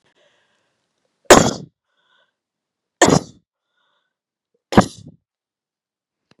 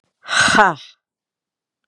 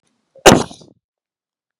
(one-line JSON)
{"three_cough_length": "6.4 s", "three_cough_amplitude": 32768, "three_cough_signal_mean_std_ratio": 0.2, "exhalation_length": "1.9 s", "exhalation_amplitude": 32768, "exhalation_signal_mean_std_ratio": 0.38, "cough_length": "1.8 s", "cough_amplitude": 32768, "cough_signal_mean_std_ratio": 0.23, "survey_phase": "beta (2021-08-13 to 2022-03-07)", "age": "45-64", "gender": "Female", "wearing_mask": "No", "symptom_none": true, "smoker_status": "Never smoked", "respiratory_condition_asthma": false, "respiratory_condition_other": false, "recruitment_source": "REACT", "submission_delay": "2 days", "covid_test_result": "Negative", "covid_test_method": "RT-qPCR", "influenza_a_test_result": "Negative", "influenza_b_test_result": "Negative"}